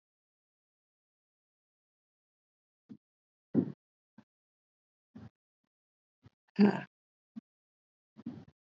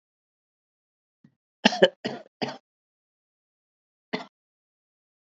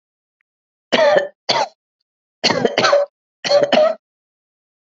{"exhalation_length": "8.6 s", "exhalation_amplitude": 6806, "exhalation_signal_mean_std_ratio": 0.16, "cough_length": "5.4 s", "cough_amplitude": 27145, "cough_signal_mean_std_ratio": 0.16, "three_cough_length": "4.9 s", "three_cough_amplitude": 28994, "three_cough_signal_mean_std_ratio": 0.47, "survey_phase": "alpha (2021-03-01 to 2021-08-12)", "age": "45-64", "gender": "Female", "wearing_mask": "No", "symptom_headache": true, "smoker_status": "Never smoked", "respiratory_condition_asthma": false, "respiratory_condition_other": false, "recruitment_source": "Test and Trace", "submission_delay": "1 day", "covid_test_result": "Positive", "covid_test_method": "RT-qPCR", "covid_ct_value": 12.0, "covid_ct_gene": "ORF1ab gene", "covid_ct_mean": 12.6, "covid_viral_load": "72000000 copies/ml", "covid_viral_load_category": "High viral load (>1M copies/ml)"}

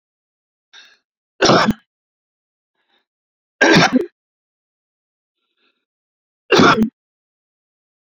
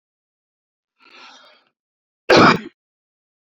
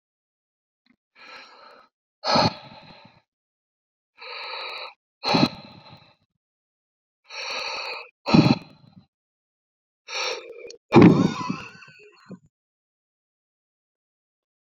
{"three_cough_length": "8.0 s", "three_cough_amplitude": 28943, "three_cough_signal_mean_std_ratio": 0.29, "cough_length": "3.6 s", "cough_amplitude": 30844, "cough_signal_mean_std_ratio": 0.24, "exhalation_length": "14.7 s", "exhalation_amplitude": 27861, "exhalation_signal_mean_std_ratio": 0.27, "survey_phase": "beta (2021-08-13 to 2022-03-07)", "age": "45-64", "gender": "Male", "wearing_mask": "No", "symptom_none": true, "smoker_status": "Ex-smoker", "respiratory_condition_asthma": false, "respiratory_condition_other": false, "recruitment_source": "REACT", "submission_delay": "1 day", "covid_test_result": "Negative", "covid_test_method": "RT-qPCR"}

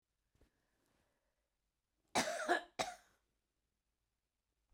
{"cough_length": "4.7 s", "cough_amplitude": 2742, "cough_signal_mean_std_ratio": 0.26, "survey_phase": "beta (2021-08-13 to 2022-03-07)", "age": "65+", "gender": "Female", "wearing_mask": "No", "symptom_none": true, "smoker_status": "Ex-smoker", "respiratory_condition_asthma": false, "respiratory_condition_other": false, "recruitment_source": "REACT", "submission_delay": "1 day", "covid_test_result": "Negative", "covid_test_method": "RT-qPCR", "influenza_a_test_result": "Negative", "influenza_b_test_result": "Negative"}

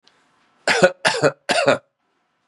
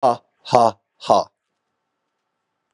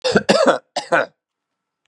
{"three_cough_length": "2.5 s", "three_cough_amplitude": 32768, "three_cough_signal_mean_std_ratio": 0.42, "exhalation_length": "2.7 s", "exhalation_amplitude": 32768, "exhalation_signal_mean_std_ratio": 0.31, "cough_length": "1.9 s", "cough_amplitude": 32767, "cough_signal_mean_std_ratio": 0.45, "survey_phase": "beta (2021-08-13 to 2022-03-07)", "age": "45-64", "gender": "Male", "wearing_mask": "No", "symptom_none": true, "smoker_status": "Never smoked", "respiratory_condition_asthma": true, "respiratory_condition_other": false, "recruitment_source": "REACT", "submission_delay": "4 days", "covid_test_result": "Negative", "covid_test_method": "RT-qPCR", "influenza_a_test_result": "Unknown/Void", "influenza_b_test_result": "Unknown/Void"}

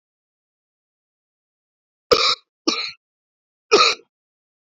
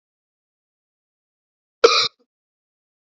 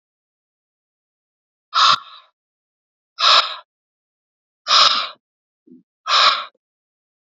{"three_cough_length": "4.8 s", "three_cough_amplitude": 30757, "three_cough_signal_mean_std_ratio": 0.27, "cough_length": "3.1 s", "cough_amplitude": 28859, "cough_signal_mean_std_ratio": 0.19, "exhalation_length": "7.3 s", "exhalation_amplitude": 32077, "exhalation_signal_mean_std_ratio": 0.33, "survey_phase": "beta (2021-08-13 to 2022-03-07)", "age": "18-44", "gender": "Male", "wearing_mask": "No", "symptom_cough_any": true, "symptom_runny_or_blocked_nose": true, "symptom_fatigue": true, "symptom_headache": true, "symptom_other": true, "symptom_onset": "3 days", "smoker_status": "Never smoked", "respiratory_condition_asthma": false, "respiratory_condition_other": false, "recruitment_source": "Test and Trace", "submission_delay": "2 days", "covid_test_result": "Positive", "covid_test_method": "RT-qPCR"}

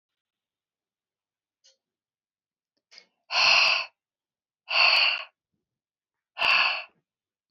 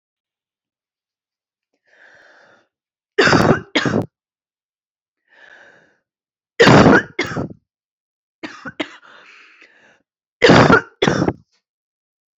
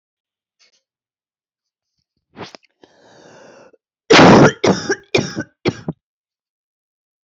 {"exhalation_length": "7.5 s", "exhalation_amplitude": 14287, "exhalation_signal_mean_std_ratio": 0.35, "three_cough_length": "12.4 s", "three_cough_amplitude": 32768, "three_cough_signal_mean_std_ratio": 0.31, "cough_length": "7.3 s", "cough_amplitude": 29762, "cough_signal_mean_std_ratio": 0.28, "survey_phase": "beta (2021-08-13 to 2022-03-07)", "age": "45-64", "gender": "Female", "wearing_mask": "No", "symptom_cough_any": true, "symptom_new_continuous_cough": true, "symptom_runny_or_blocked_nose": true, "symptom_shortness_of_breath": true, "symptom_sore_throat": true, "symptom_fatigue": true, "symptom_onset": "2 days", "smoker_status": "Ex-smoker", "respiratory_condition_asthma": false, "respiratory_condition_other": false, "recruitment_source": "Test and Trace", "submission_delay": "1 day", "covid_test_result": "Negative", "covid_test_method": "RT-qPCR"}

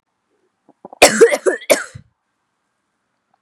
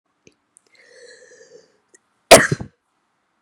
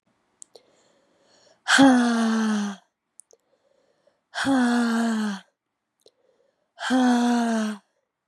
{"three_cough_length": "3.4 s", "three_cough_amplitude": 32768, "three_cough_signal_mean_std_ratio": 0.29, "cough_length": "3.4 s", "cough_amplitude": 32768, "cough_signal_mean_std_ratio": 0.18, "exhalation_length": "8.3 s", "exhalation_amplitude": 20737, "exhalation_signal_mean_std_ratio": 0.52, "survey_phase": "beta (2021-08-13 to 2022-03-07)", "age": "18-44", "gender": "Female", "wearing_mask": "No", "symptom_cough_any": true, "symptom_runny_or_blocked_nose": true, "symptom_sore_throat": true, "symptom_onset": "3 days", "smoker_status": "Never smoked", "respiratory_condition_asthma": true, "respiratory_condition_other": false, "recruitment_source": "Test and Trace", "submission_delay": "1 day", "covid_test_result": "Positive", "covid_test_method": "RT-qPCR", "covid_ct_value": 17.5, "covid_ct_gene": "ORF1ab gene", "covid_ct_mean": 18.2, "covid_viral_load": "1100000 copies/ml", "covid_viral_load_category": "High viral load (>1M copies/ml)"}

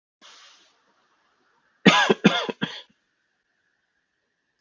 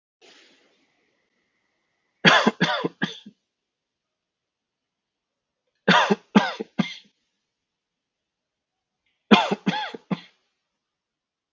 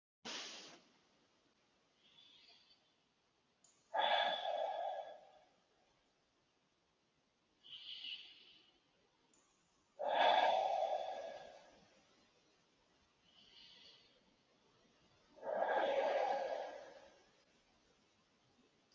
{"cough_length": "4.6 s", "cough_amplitude": 28589, "cough_signal_mean_std_ratio": 0.25, "three_cough_length": "11.5 s", "three_cough_amplitude": 32767, "three_cough_signal_mean_std_ratio": 0.26, "exhalation_length": "18.9 s", "exhalation_amplitude": 2880, "exhalation_signal_mean_std_ratio": 0.4, "survey_phase": "beta (2021-08-13 to 2022-03-07)", "age": "18-44", "gender": "Male", "wearing_mask": "No", "symptom_cough_any": true, "smoker_status": "Never smoked", "respiratory_condition_asthma": false, "respiratory_condition_other": false, "recruitment_source": "REACT", "submission_delay": "1 day", "covid_test_result": "Negative", "covid_test_method": "RT-qPCR", "influenza_a_test_result": "Negative", "influenza_b_test_result": "Negative"}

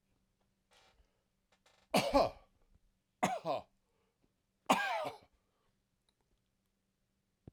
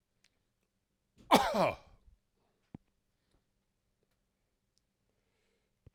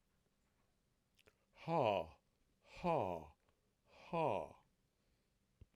{"three_cough_length": "7.5 s", "three_cough_amplitude": 6747, "three_cough_signal_mean_std_ratio": 0.28, "cough_length": "5.9 s", "cough_amplitude": 11428, "cough_signal_mean_std_ratio": 0.2, "exhalation_length": "5.8 s", "exhalation_amplitude": 2304, "exhalation_signal_mean_std_ratio": 0.35, "survey_phase": "beta (2021-08-13 to 2022-03-07)", "age": "45-64", "gender": "Male", "wearing_mask": "No", "symptom_none": true, "smoker_status": "Never smoked", "respiratory_condition_asthma": false, "respiratory_condition_other": false, "recruitment_source": "REACT", "submission_delay": "11 days", "covid_test_result": "Negative", "covid_test_method": "RT-qPCR", "influenza_a_test_result": "Unknown/Void", "influenza_b_test_result": "Unknown/Void"}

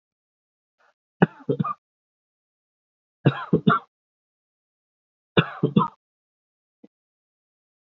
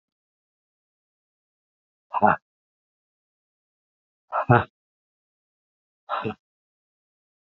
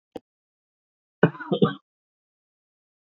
{"three_cough_length": "7.9 s", "three_cough_amplitude": 26310, "three_cough_signal_mean_std_ratio": 0.23, "exhalation_length": "7.4 s", "exhalation_amplitude": 26692, "exhalation_signal_mean_std_ratio": 0.19, "cough_length": "3.1 s", "cough_amplitude": 25911, "cough_signal_mean_std_ratio": 0.21, "survey_phase": "beta (2021-08-13 to 2022-03-07)", "age": "65+", "gender": "Male", "wearing_mask": "No", "symptom_runny_or_blocked_nose": true, "symptom_shortness_of_breath": true, "smoker_status": "Ex-smoker", "respiratory_condition_asthma": false, "respiratory_condition_other": false, "recruitment_source": "REACT", "submission_delay": "1 day", "covid_test_result": "Negative", "covid_test_method": "RT-qPCR", "influenza_a_test_result": "Negative", "influenza_b_test_result": "Negative"}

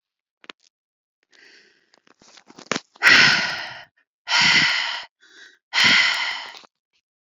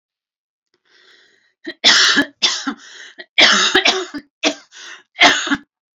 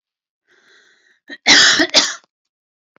{"exhalation_length": "7.3 s", "exhalation_amplitude": 29578, "exhalation_signal_mean_std_ratio": 0.41, "three_cough_length": "6.0 s", "three_cough_amplitude": 32768, "three_cough_signal_mean_std_ratio": 0.44, "cough_length": "3.0 s", "cough_amplitude": 32261, "cough_signal_mean_std_ratio": 0.36, "survey_phase": "beta (2021-08-13 to 2022-03-07)", "age": "45-64", "gender": "Female", "wearing_mask": "No", "symptom_runny_or_blocked_nose": true, "symptom_fatigue": true, "symptom_headache": true, "smoker_status": "Never smoked", "respiratory_condition_asthma": false, "respiratory_condition_other": false, "recruitment_source": "Test and Trace", "submission_delay": "2 days", "covid_test_result": "Positive", "covid_test_method": "RT-qPCR"}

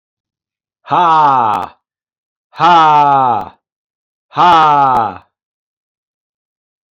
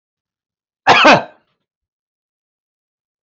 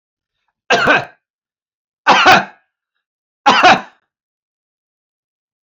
{"exhalation_length": "6.9 s", "exhalation_amplitude": 28872, "exhalation_signal_mean_std_ratio": 0.51, "cough_length": "3.2 s", "cough_amplitude": 29520, "cough_signal_mean_std_ratio": 0.27, "three_cough_length": "5.6 s", "three_cough_amplitude": 30020, "three_cough_signal_mean_std_ratio": 0.35, "survey_phase": "beta (2021-08-13 to 2022-03-07)", "age": "45-64", "gender": "Male", "wearing_mask": "No", "symptom_none": true, "smoker_status": "Ex-smoker", "respiratory_condition_asthma": false, "respiratory_condition_other": false, "recruitment_source": "REACT", "submission_delay": "2 days", "covid_test_result": "Negative", "covid_test_method": "RT-qPCR", "influenza_a_test_result": "Negative", "influenza_b_test_result": "Negative"}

